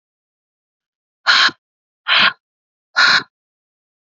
{"exhalation_length": "4.0 s", "exhalation_amplitude": 31226, "exhalation_signal_mean_std_ratio": 0.34, "survey_phase": "beta (2021-08-13 to 2022-03-07)", "age": "18-44", "gender": "Female", "wearing_mask": "No", "symptom_cough_any": true, "symptom_new_continuous_cough": true, "symptom_runny_or_blocked_nose": true, "symptom_headache": true, "symptom_change_to_sense_of_smell_or_taste": true, "symptom_loss_of_taste": true, "symptom_onset": "3 days", "smoker_status": "Ex-smoker", "respiratory_condition_asthma": false, "respiratory_condition_other": false, "recruitment_source": "Test and Trace", "submission_delay": "2 days", "covid_test_result": "Positive", "covid_test_method": "ePCR"}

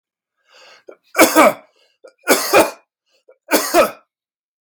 {"three_cough_length": "4.6 s", "three_cough_amplitude": 32768, "three_cough_signal_mean_std_ratio": 0.38, "survey_phase": "beta (2021-08-13 to 2022-03-07)", "age": "45-64", "gender": "Male", "wearing_mask": "No", "symptom_abdominal_pain": true, "symptom_diarrhoea": true, "smoker_status": "Never smoked", "respiratory_condition_asthma": false, "respiratory_condition_other": false, "recruitment_source": "REACT", "submission_delay": "3 days", "covid_test_result": "Negative", "covid_test_method": "RT-qPCR"}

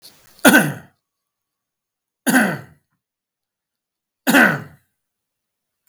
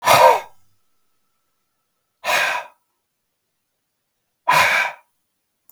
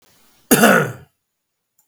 {"three_cough_length": "5.9 s", "three_cough_amplitude": 32768, "three_cough_signal_mean_std_ratio": 0.3, "exhalation_length": "5.7 s", "exhalation_amplitude": 32767, "exhalation_signal_mean_std_ratio": 0.34, "cough_length": "1.9 s", "cough_amplitude": 32768, "cough_signal_mean_std_ratio": 0.36, "survey_phase": "beta (2021-08-13 to 2022-03-07)", "age": "45-64", "gender": "Male", "wearing_mask": "No", "symptom_none": true, "symptom_onset": "13 days", "smoker_status": "Ex-smoker", "respiratory_condition_asthma": false, "respiratory_condition_other": false, "recruitment_source": "REACT", "submission_delay": "1 day", "covid_test_result": "Negative", "covid_test_method": "RT-qPCR", "influenza_a_test_result": "Negative", "influenza_b_test_result": "Negative"}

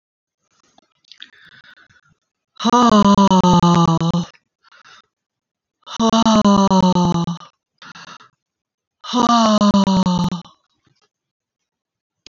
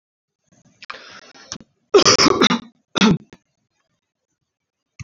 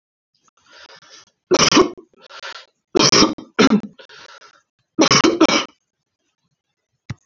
{"exhalation_length": "12.3 s", "exhalation_amplitude": 28537, "exhalation_signal_mean_std_ratio": 0.48, "cough_length": "5.0 s", "cough_amplitude": 29400, "cough_signal_mean_std_ratio": 0.32, "three_cough_length": "7.3 s", "three_cough_amplitude": 32388, "three_cough_signal_mean_std_ratio": 0.37, "survey_phase": "beta (2021-08-13 to 2022-03-07)", "age": "45-64", "gender": "Female", "wearing_mask": "No", "symptom_runny_or_blocked_nose": true, "symptom_fatigue": true, "symptom_onset": "9 days", "smoker_status": "Never smoked", "respiratory_condition_asthma": false, "respiratory_condition_other": false, "recruitment_source": "REACT", "submission_delay": "1 day", "covid_test_result": "Negative", "covid_test_method": "RT-qPCR"}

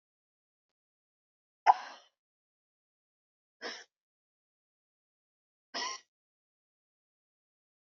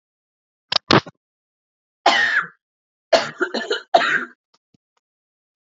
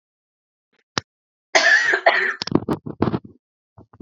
{"exhalation_length": "7.9 s", "exhalation_amplitude": 12818, "exhalation_signal_mean_std_ratio": 0.13, "three_cough_length": "5.7 s", "three_cough_amplitude": 32768, "three_cough_signal_mean_std_ratio": 0.34, "cough_length": "4.0 s", "cough_amplitude": 32767, "cough_signal_mean_std_ratio": 0.4, "survey_phase": "beta (2021-08-13 to 2022-03-07)", "age": "18-44", "gender": "Female", "wearing_mask": "Yes", "symptom_cough_any": true, "symptom_runny_or_blocked_nose": true, "symptom_sore_throat": true, "symptom_fatigue": true, "symptom_headache": true, "smoker_status": "Ex-smoker", "respiratory_condition_asthma": false, "respiratory_condition_other": false, "recruitment_source": "Test and Trace", "submission_delay": "1 day", "covid_test_result": "Positive", "covid_test_method": "RT-qPCR", "covid_ct_value": 25.8, "covid_ct_gene": "ORF1ab gene", "covid_ct_mean": 26.7, "covid_viral_load": "1800 copies/ml", "covid_viral_load_category": "Minimal viral load (< 10K copies/ml)"}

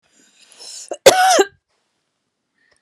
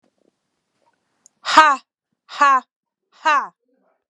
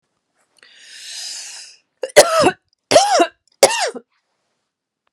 {"cough_length": "2.8 s", "cough_amplitude": 32768, "cough_signal_mean_std_ratio": 0.31, "exhalation_length": "4.1 s", "exhalation_amplitude": 32768, "exhalation_signal_mean_std_ratio": 0.32, "three_cough_length": "5.1 s", "three_cough_amplitude": 32768, "three_cough_signal_mean_std_ratio": 0.35, "survey_phase": "beta (2021-08-13 to 2022-03-07)", "age": "45-64", "gender": "Female", "wearing_mask": "Yes", "symptom_headache": true, "smoker_status": "Never smoked", "respiratory_condition_asthma": false, "respiratory_condition_other": false, "recruitment_source": "Test and Trace", "submission_delay": "1 day", "covid_test_result": "Positive", "covid_test_method": "ePCR"}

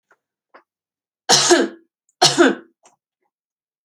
{"three_cough_length": "3.8 s", "three_cough_amplitude": 32767, "three_cough_signal_mean_std_ratio": 0.33, "survey_phase": "alpha (2021-03-01 to 2021-08-12)", "age": "18-44", "gender": "Female", "wearing_mask": "No", "symptom_abdominal_pain": true, "smoker_status": "Never smoked", "respiratory_condition_asthma": false, "respiratory_condition_other": false, "recruitment_source": "REACT", "submission_delay": "2 days", "covid_test_result": "Negative", "covid_test_method": "RT-qPCR"}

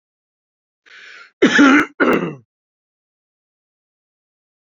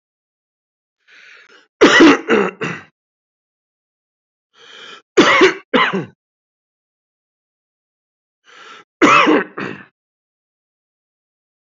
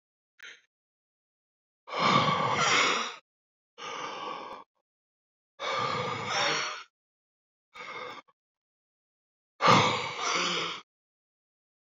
{"cough_length": "4.7 s", "cough_amplitude": 31445, "cough_signal_mean_std_ratio": 0.31, "three_cough_length": "11.6 s", "three_cough_amplitude": 29435, "three_cough_signal_mean_std_ratio": 0.32, "exhalation_length": "11.9 s", "exhalation_amplitude": 12707, "exhalation_signal_mean_std_ratio": 0.45, "survey_phase": "beta (2021-08-13 to 2022-03-07)", "age": "45-64", "gender": "Male", "wearing_mask": "No", "symptom_none": true, "smoker_status": "Ex-smoker", "respiratory_condition_asthma": false, "respiratory_condition_other": false, "recruitment_source": "Test and Trace", "submission_delay": "2 days", "covid_test_result": "Positive", "covid_test_method": "RT-qPCR", "covid_ct_value": 18.1, "covid_ct_gene": "ORF1ab gene"}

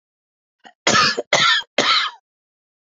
{"three_cough_length": "2.8 s", "three_cough_amplitude": 29751, "three_cough_signal_mean_std_ratio": 0.48, "survey_phase": "beta (2021-08-13 to 2022-03-07)", "age": "45-64", "gender": "Female", "wearing_mask": "No", "symptom_none": true, "smoker_status": "Ex-smoker", "respiratory_condition_asthma": true, "respiratory_condition_other": true, "recruitment_source": "Test and Trace", "submission_delay": "1 day", "covid_test_result": "Negative", "covid_test_method": "RT-qPCR"}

